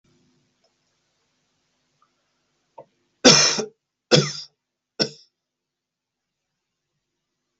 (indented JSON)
{
  "three_cough_length": "7.6 s",
  "three_cough_amplitude": 32768,
  "three_cough_signal_mean_std_ratio": 0.21,
  "survey_phase": "beta (2021-08-13 to 2022-03-07)",
  "age": "45-64",
  "gender": "Male",
  "wearing_mask": "No",
  "symptom_none": true,
  "symptom_onset": "2 days",
  "smoker_status": "Never smoked",
  "respiratory_condition_asthma": false,
  "respiratory_condition_other": false,
  "recruitment_source": "REACT",
  "submission_delay": "2 days",
  "covid_test_result": "Negative",
  "covid_test_method": "RT-qPCR",
  "influenza_a_test_result": "Negative",
  "influenza_b_test_result": "Negative"
}